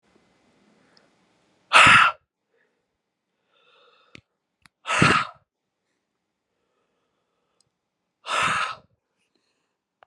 {
  "exhalation_length": "10.1 s",
  "exhalation_amplitude": 32610,
  "exhalation_signal_mean_std_ratio": 0.25,
  "survey_phase": "beta (2021-08-13 to 2022-03-07)",
  "age": "18-44",
  "gender": "Male",
  "wearing_mask": "No",
  "symptom_fatigue": true,
  "symptom_headache": true,
  "smoker_status": "Never smoked",
  "respiratory_condition_asthma": false,
  "respiratory_condition_other": false,
  "recruitment_source": "REACT",
  "submission_delay": "2 days",
  "covid_test_result": "Negative",
  "covid_test_method": "RT-qPCR",
  "influenza_a_test_result": "Negative",
  "influenza_b_test_result": "Negative"
}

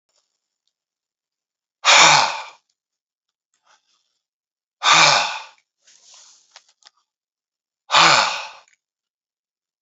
{
  "exhalation_length": "9.8 s",
  "exhalation_amplitude": 32319,
  "exhalation_signal_mean_std_ratio": 0.3,
  "survey_phase": "beta (2021-08-13 to 2022-03-07)",
  "age": "45-64",
  "gender": "Male",
  "wearing_mask": "No",
  "symptom_none": true,
  "smoker_status": "Ex-smoker",
  "respiratory_condition_asthma": false,
  "respiratory_condition_other": false,
  "recruitment_source": "REACT",
  "submission_delay": "2 days",
  "covid_test_result": "Negative",
  "covid_test_method": "RT-qPCR",
  "influenza_a_test_result": "Negative",
  "influenza_b_test_result": "Negative"
}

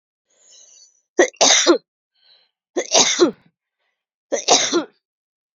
{
  "three_cough_length": "5.5 s",
  "three_cough_amplitude": 32768,
  "three_cough_signal_mean_std_ratio": 0.38,
  "survey_phase": "beta (2021-08-13 to 2022-03-07)",
  "age": "18-44",
  "gender": "Female",
  "wearing_mask": "No",
  "symptom_runny_or_blocked_nose": true,
  "symptom_diarrhoea": true,
  "symptom_fatigue": true,
  "symptom_fever_high_temperature": true,
  "symptom_headache": true,
  "symptom_onset": "2 days",
  "smoker_status": "Current smoker (e-cigarettes or vapes only)",
  "respiratory_condition_asthma": false,
  "respiratory_condition_other": false,
  "recruitment_source": "Test and Trace",
  "submission_delay": "1 day",
  "covid_test_result": "Positive",
  "covid_test_method": "RT-qPCR",
  "covid_ct_value": 13.5,
  "covid_ct_gene": "ORF1ab gene",
  "covid_ct_mean": 14.2,
  "covid_viral_load": "23000000 copies/ml",
  "covid_viral_load_category": "High viral load (>1M copies/ml)"
}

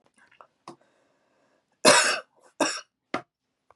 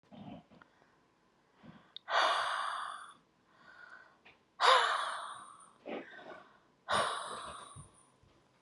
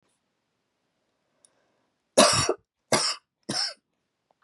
{
  "cough_length": "3.8 s",
  "cough_amplitude": 27508,
  "cough_signal_mean_std_ratio": 0.27,
  "exhalation_length": "8.6 s",
  "exhalation_amplitude": 7762,
  "exhalation_signal_mean_std_ratio": 0.41,
  "three_cough_length": "4.4 s",
  "three_cough_amplitude": 22328,
  "three_cough_signal_mean_std_ratio": 0.3,
  "survey_phase": "beta (2021-08-13 to 2022-03-07)",
  "age": "45-64",
  "gender": "Female",
  "wearing_mask": "No",
  "symptom_cough_any": true,
  "symptom_shortness_of_breath": true,
  "smoker_status": "Ex-smoker",
  "respiratory_condition_asthma": true,
  "respiratory_condition_other": true,
  "recruitment_source": "REACT",
  "submission_delay": "4 days",
  "covid_test_result": "Negative",
  "covid_test_method": "RT-qPCR",
  "influenza_a_test_result": "Negative",
  "influenza_b_test_result": "Negative"
}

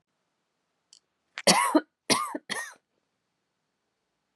{
  "three_cough_length": "4.4 s",
  "three_cough_amplitude": 22547,
  "three_cough_signal_mean_std_ratio": 0.28,
  "survey_phase": "beta (2021-08-13 to 2022-03-07)",
  "age": "18-44",
  "gender": "Female",
  "wearing_mask": "Yes",
  "symptom_cough_any": true,
  "symptom_runny_or_blocked_nose": true,
  "symptom_fatigue": true,
  "symptom_headache": true,
  "symptom_change_to_sense_of_smell_or_taste": true,
  "symptom_other": true,
  "symptom_onset": "3 days",
  "smoker_status": "Never smoked",
  "respiratory_condition_asthma": true,
  "respiratory_condition_other": false,
  "recruitment_source": "Test and Trace",
  "submission_delay": "1 day",
  "covid_test_result": "Positive",
  "covid_test_method": "RT-qPCR",
  "covid_ct_value": 18.3,
  "covid_ct_gene": "N gene",
  "covid_ct_mean": 18.3,
  "covid_viral_load": "970000 copies/ml",
  "covid_viral_load_category": "Low viral load (10K-1M copies/ml)"
}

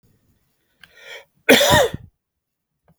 {
  "cough_length": "3.0 s",
  "cough_amplitude": 32768,
  "cough_signal_mean_std_ratio": 0.31,
  "survey_phase": "beta (2021-08-13 to 2022-03-07)",
  "age": "18-44",
  "gender": "Male",
  "wearing_mask": "No",
  "symptom_none": true,
  "symptom_onset": "3 days",
  "smoker_status": "Never smoked",
  "respiratory_condition_asthma": false,
  "respiratory_condition_other": false,
  "recruitment_source": "REACT",
  "submission_delay": "1 day",
  "covid_test_result": "Negative",
  "covid_test_method": "RT-qPCR",
  "influenza_a_test_result": "Unknown/Void",
  "influenza_b_test_result": "Unknown/Void"
}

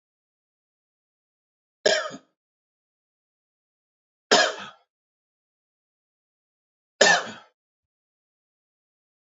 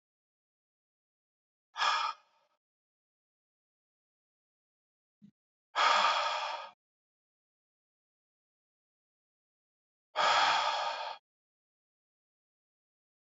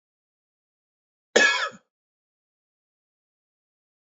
{
  "three_cough_length": "9.3 s",
  "three_cough_amplitude": 26454,
  "three_cough_signal_mean_std_ratio": 0.2,
  "exhalation_length": "13.4 s",
  "exhalation_amplitude": 6900,
  "exhalation_signal_mean_std_ratio": 0.31,
  "cough_length": "4.1 s",
  "cough_amplitude": 27322,
  "cough_signal_mean_std_ratio": 0.21,
  "survey_phase": "alpha (2021-03-01 to 2021-08-12)",
  "age": "45-64",
  "gender": "Male",
  "wearing_mask": "No",
  "symptom_cough_any": true,
  "symptom_abdominal_pain": true,
  "symptom_fatigue": true,
  "symptom_fever_high_temperature": true,
  "symptom_onset": "4 days",
  "smoker_status": "Never smoked",
  "respiratory_condition_asthma": false,
  "respiratory_condition_other": false,
  "recruitment_source": "Test and Trace",
  "submission_delay": "2 days",
  "covid_test_result": "Positive",
  "covid_test_method": "RT-qPCR",
  "covid_ct_value": 17.7,
  "covid_ct_gene": "ORF1ab gene"
}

